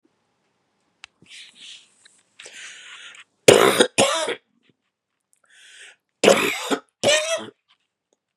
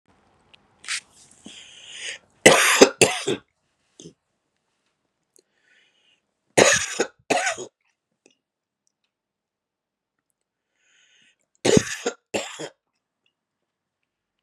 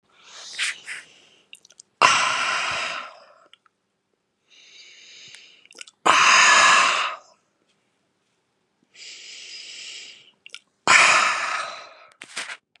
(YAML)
cough_length: 8.4 s
cough_amplitude: 32768
cough_signal_mean_std_ratio: 0.32
three_cough_length: 14.4 s
three_cough_amplitude: 32768
three_cough_signal_mean_std_ratio: 0.25
exhalation_length: 12.8 s
exhalation_amplitude: 32767
exhalation_signal_mean_std_ratio: 0.4
survey_phase: beta (2021-08-13 to 2022-03-07)
age: 45-64
gender: Male
wearing_mask: 'No'
symptom_cough_any: true
symptom_runny_or_blocked_nose: true
symptom_sore_throat: true
symptom_abdominal_pain: true
symptom_diarrhoea: true
symptom_fatigue: true
symptom_fever_high_temperature: true
symptom_headache: true
smoker_status: Never smoked
respiratory_condition_asthma: false
respiratory_condition_other: false
recruitment_source: Test and Trace
submission_delay: 1 day
covid_test_result: Positive
covid_test_method: RT-qPCR
covid_ct_value: 20.9
covid_ct_gene: ORF1ab gene
covid_ct_mean: 21.2
covid_viral_load: 110000 copies/ml
covid_viral_load_category: Low viral load (10K-1M copies/ml)